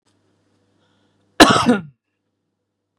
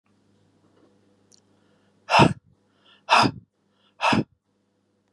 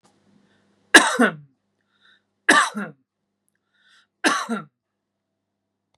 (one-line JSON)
{"cough_length": "3.0 s", "cough_amplitude": 32768, "cough_signal_mean_std_ratio": 0.26, "exhalation_length": "5.1 s", "exhalation_amplitude": 27567, "exhalation_signal_mean_std_ratio": 0.27, "three_cough_length": "6.0 s", "three_cough_amplitude": 32768, "three_cough_signal_mean_std_ratio": 0.27, "survey_phase": "beta (2021-08-13 to 2022-03-07)", "age": "45-64", "gender": "Male", "wearing_mask": "No", "symptom_none": true, "smoker_status": "Never smoked", "respiratory_condition_asthma": false, "respiratory_condition_other": false, "recruitment_source": "REACT", "submission_delay": "0 days", "covid_test_result": "Negative", "covid_test_method": "RT-qPCR", "influenza_a_test_result": "Negative", "influenza_b_test_result": "Negative"}